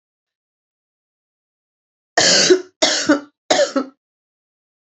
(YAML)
three_cough_length: 4.9 s
three_cough_amplitude: 32283
three_cough_signal_mean_std_ratio: 0.37
survey_phase: alpha (2021-03-01 to 2021-08-12)
age: 65+
gender: Female
wearing_mask: 'No'
symptom_cough_any: true
symptom_fatigue: true
symptom_headache: true
smoker_status: Ex-smoker
respiratory_condition_asthma: true
respiratory_condition_other: false
recruitment_source: Test and Trace
submission_delay: 2 days
covid_test_result: Positive
covid_test_method: RT-qPCR
covid_ct_value: 21.9
covid_ct_gene: ORF1ab gene
covid_ct_mean: 22.8
covid_viral_load: 32000 copies/ml
covid_viral_load_category: Low viral load (10K-1M copies/ml)